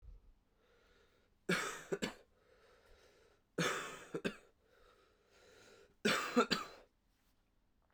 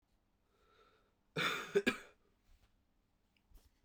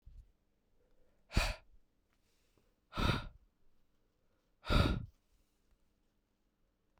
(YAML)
three_cough_length: 7.9 s
three_cough_amplitude: 3941
three_cough_signal_mean_std_ratio: 0.35
cough_length: 3.8 s
cough_amplitude: 3813
cough_signal_mean_std_ratio: 0.28
exhalation_length: 7.0 s
exhalation_amplitude: 4764
exhalation_signal_mean_std_ratio: 0.28
survey_phase: beta (2021-08-13 to 2022-03-07)
age: 18-44
gender: Male
wearing_mask: 'No'
symptom_runny_or_blocked_nose: true
symptom_headache: true
symptom_other: true
smoker_status: Never smoked
respiratory_condition_asthma: false
respiratory_condition_other: false
recruitment_source: Test and Trace
submission_delay: 2 days
covid_test_result: Positive
covid_test_method: RT-qPCR
covid_ct_value: 17.8
covid_ct_gene: ORF1ab gene